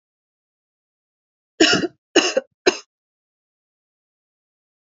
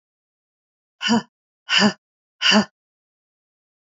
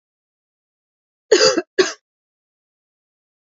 {"three_cough_length": "4.9 s", "three_cough_amplitude": 29081, "three_cough_signal_mean_std_ratio": 0.24, "exhalation_length": "3.8 s", "exhalation_amplitude": 23766, "exhalation_signal_mean_std_ratio": 0.33, "cough_length": "3.5 s", "cough_amplitude": 29498, "cough_signal_mean_std_ratio": 0.25, "survey_phase": "beta (2021-08-13 to 2022-03-07)", "age": "45-64", "gender": "Female", "wearing_mask": "No", "symptom_none": true, "smoker_status": "Never smoked", "respiratory_condition_asthma": true, "respiratory_condition_other": false, "recruitment_source": "REACT", "submission_delay": "1 day", "covid_test_result": "Negative", "covid_test_method": "RT-qPCR", "influenza_a_test_result": "Negative", "influenza_b_test_result": "Negative"}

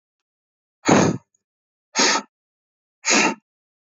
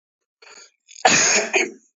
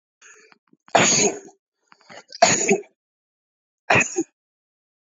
{"exhalation_length": "3.8 s", "exhalation_amplitude": 26763, "exhalation_signal_mean_std_ratio": 0.37, "cough_length": "2.0 s", "cough_amplitude": 26620, "cough_signal_mean_std_ratio": 0.46, "three_cough_length": "5.1 s", "three_cough_amplitude": 32767, "three_cough_signal_mean_std_ratio": 0.36, "survey_phase": "beta (2021-08-13 to 2022-03-07)", "age": "18-44", "gender": "Male", "wearing_mask": "No", "symptom_cough_any": true, "symptom_runny_or_blocked_nose": true, "symptom_onset": "8 days", "smoker_status": "Current smoker (1 to 10 cigarettes per day)", "respiratory_condition_asthma": false, "respiratory_condition_other": false, "recruitment_source": "REACT", "submission_delay": "1 day", "covid_test_result": "Negative", "covid_test_method": "RT-qPCR"}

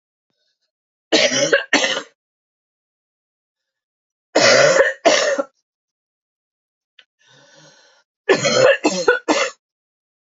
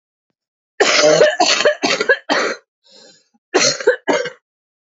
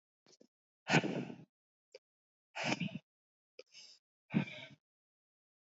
{"three_cough_length": "10.2 s", "three_cough_amplitude": 30538, "three_cough_signal_mean_std_ratio": 0.4, "cough_length": "4.9 s", "cough_amplitude": 32205, "cough_signal_mean_std_ratio": 0.53, "exhalation_length": "5.6 s", "exhalation_amplitude": 6129, "exhalation_signal_mean_std_ratio": 0.3, "survey_phase": "beta (2021-08-13 to 2022-03-07)", "age": "18-44", "gender": "Female", "wearing_mask": "No", "symptom_cough_any": true, "symptom_runny_or_blocked_nose": true, "symptom_shortness_of_breath": true, "symptom_diarrhoea": true, "symptom_fatigue": true, "symptom_fever_high_temperature": true, "symptom_change_to_sense_of_smell_or_taste": true, "symptom_onset": "7 days", "smoker_status": "Never smoked", "respiratory_condition_asthma": false, "respiratory_condition_other": false, "recruitment_source": "Test and Trace", "submission_delay": "2 days", "covid_test_result": "Positive", "covid_test_method": "RT-qPCR", "covid_ct_value": 10.7, "covid_ct_gene": "ORF1ab gene", "covid_ct_mean": 10.8, "covid_viral_load": "280000000 copies/ml", "covid_viral_load_category": "High viral load (>1M copies/ml)"}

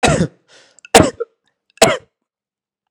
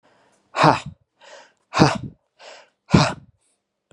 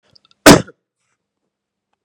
{"three_cough_length": "2.9 s", "three_cough_amplitude": 32768, "three_cough_signal_mean_std_ratio": 0.33, "exhalation_length": "3.9 s", "exhalation_amplitude": 32767, "exhalation_signal_mean_std_ratio": 0.31, "cough_length": "2.0 s", "cough_amplitude": 32768, "cough_signal_mean_std_ratio": 0.22, "survey_phase": "beta (2021-08-13 to 2022-03-07)", "age": "18-44", "gender": "Male", "wearing_mask": "No", "symptom_none": true, "smoker_status": "Never smoked", "respiratory_condition_asthma": false, "respiratory_condition_other": false, "recruitment_source": "REACT", "submission_delay": "2 days", "covid_test_result": "Negative", "covid_test_method": "RT-qPCR", "influenza_a_test_result": "Negative", "influenza_b_test_result": "Negative"}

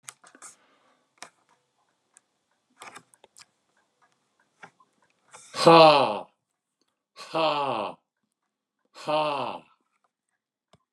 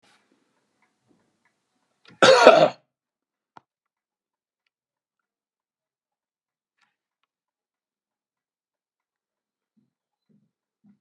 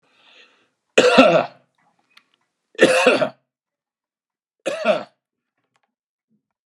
{"exhalation_length": "10.9 s", "exhalation_amplitude": 24911, "exhalation_signal_mean_std_ratio": 0.26, "cough_length": "11.0 s", "cough_amplitude": 32768, "cough_signal_mean_std_ratio": 0.16, "three_cough_length": "6.7 s", "three_cough_amplitude": 32768, "three_cough_signal_mean_std_ratio": 0.33, "survey_phase": "beta (2021-08-13 to 2022-03-07)", "age": "65+", "gender": "Male", "wearing_mask": "No", "symptom_none": true, "smoker_status": "Ex-smoker", "respiratory_condition_asthma": false, "respiratory_condition_other": false, "recruitment_source": "REACT", "submission_delay": "2 days", "covid_test_result": "Negative", "covid_test_method": "RT-qPCR"}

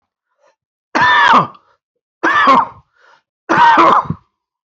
{"three_cough_length": "4.8 s", "three_cough_amplitude": 30081, "three_cough_signal_mean_std_ratio": 0.5, "survey_phase": "beta (2021-08-13 to 2022-03-07)", "age": "45-64", "gender": "Female", "wearing_mask": "No", "symptom_cough_any": true, "symptom_fatigue": true, "symptom_change_to_sense_of_smell_or_taste": true, "symptom_loss_of_taste": true, "symptom_onset": "9 days", "smoker_status": "Never smoked", "respiratory_condition_asthma": false, "respiratory_condition_other": false, "recruitment_source": "Test and Trace", "submission_delay": "1 day", "covid_test_result": "Positive", "covid_test_method": "RT-qPCR", "covid_ct_value": 22.6, "covid_ct_gene": "ORF1ab gene"}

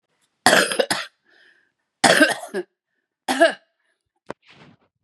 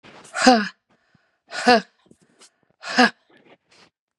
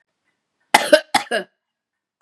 {"three_cough_length": "5.0 s", "three_cough_amplitude": 32768, "three_cough_signal_mean_std_ratio": 0.34, "exhalation_length": "4.2 s", "exhalation_amplitude": 32767, "exhalation_signal_mean_std_ratio": 0.3, "cough_length": "2.2 s", "cough_amplitude": 32768, "cough_signal_mean_std_ratio": 0.27, "survey_phase": "beta (2021-08-13 to 2022-03-07)", "age": "45-64", "gender": "Female", "wearing_mask": "No", "symptom_none": true, "smoker_status": "Current smoker (1 to 10 cigarettes per day)", "respiratory_condition_asthma": false, "respiratory_condition_other": false, "recruitment_source": "Test and Trace", "submission_delay": "1 day", "covid_test_result": "Negative", "covid_test_method": "RT-qPCR"}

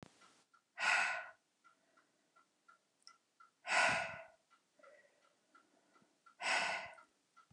{"exhalation_length": "7.5 s", "exhalation_amplitude": 3466, "exhalation_signal_mean_std_ratio": 0.35, "survey_phase": "beta (2021-08-13 to 2022-03-07)", "age": "45-64", "gender": "Female", "wearing_mask": "No", "symptom_none": true, "smoker_status": "Never smoked", "respiratory_condition_asthma": false, "respiratory_condition_other": false, "recruitment_source": "REACT", "submission_delay": "1 day", "covid_test_result": "Negative", "covid_test_method": "RT-qPCR"}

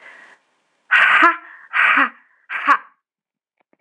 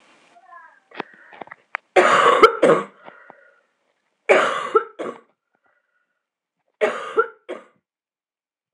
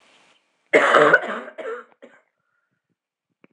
{"exhalation_length": "3.8 s", "exhalation_amplitude": 26028, "exhalation_signal_mean_std_ratio": 0.43, "three_cough_length": "8.7 s", "three_cough_amplitude": 26028, "three_cough_signal_mean_std_ratio": 0.33, "cough_length": "3.5 s", "cough_amplitude": 26027, "cough_signal_mean_std_ratio": 0.34, "survey_phase": "alpha (2021-03-01 to 2021-08-12)", "age": "18-44", "gender": "Female", "wearing_mask": "No", "symptom_cough_any": true, "symptom_change_to_sense_of_smell_or_taste": true, "symptom_onset": "2 days", "smoker_status": "Never smoked", "respiratory_condition_asthma": false, "respiratory_condition_other": false, "recruitment_source": "Test and Trace", "submission_delay": "2 days", "covid_test_result": "Positive", "covid_test_method": "RT-qPCR"}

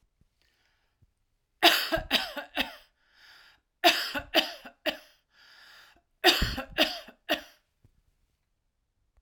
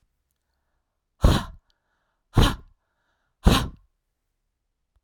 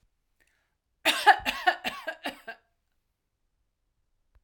{"three_cough_length": "9.2 s", "three_cough_amplitude": 18816, "three_cough_signal_mean_std_ratio": 0.32, "exhalation_length": "5.0 s", "exhalation_amplitude": 31126, "exhalation_signal_mean_std_ratio": 0.26, "cough_length": "4.4 s", "cough_amplitude": 19994, "cough_signal_mean_std_ratio": 0.26, "survey_phase": "beta (2021-08-13 to 2022-03-07)", "age": "45-64", "gender": "Female", "wearing_mask": "No", "symptom_none": true, "smoker_status": "Never smoked", "respiratory_condition_asthma": false, "respiratory_condition_other": false, "recruitment_source": "REACT", "submission_delay": "1 day", "covid_test_result": "Negative", "covid_test_method": "RT-qPCR", "influenza_a_test_result": "Negative", "influenza_b_test_result": "Negative"}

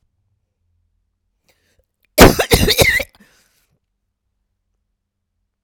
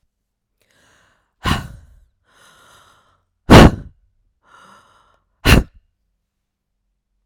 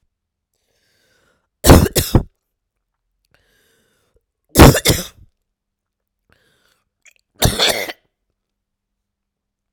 {"cough_length": "5.6 s", "cough_amplitude": 32768, "cough_signal_mean_std_ratio": 0.25, "exhalation_length": "7.3 s", "exhalation_amplitude": 32768, "exhalation_signal_mean_std_ratio": 0.21, "three_cough_length": "9.7 s", "three_cough_amplitude": 32768, "three_cough_signal_mean_std_ratio": 0.24, "survey_phase": "alpha (2021-03-01 to 2021-08-12)", "age": "45-64", "gender": "Female", "wearing_mask": "No", "symptom_cough_any": true, "symptom_new_continuous_cough": true, "symptom_shortness_of_breath": true, "symptom_fatigue": true, "symptom_fever_high_temperature": true, "symptom_headache": true, "symptom_change_to_sense_of_smell_or_taste": true, "symptom_loss_of_taste": true, "symptom_onset": "2 days", "smoker_status": "Never smoked", "respiratory_condition_asthma": false, "respiratory_condition_other": false, "recruitment_source": "Test and Trace", "submission_delay": "2 days", "covid_test_result": "Positive", "covid_test_method": "RT-qPCR", "covid_ct_value": 16.1, "covid_ct_gene": "ORF1ab gene", "covid_ct_mean": 16.3, "covid_viral_load": "4600000 copies/ml", "covid_viral_load_category": "High viral load (>1M copies/ml)"}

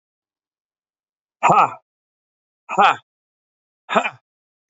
{"exhalation_length": "4.7 s", "exhalation_amplitude": 32354, "exhalation_signal_mean_std_ratio": 0.28, "survey_phase": "beta (2021-08-13 to 2022-03-07)", "age": "45-64", "gender": "Male", "wearing_mask": "No", "symptom_shortness_of_breath": true, "symptom_change_to_sense_of_smell_or_taste": true, "symptom_loss_of_taste": true, "smoker_status": "Never smoked", "respiratory_condition_asthma": false, "respiratory_condition_other": false, "recruitment_source": "REACT", "submission_delay": "1 day", "covid_test_result": "Negative", "covid_test_method": "RT-qPCR", "influenza_a_test_result": "Negative", "influenza_b_test_result": "Negative"}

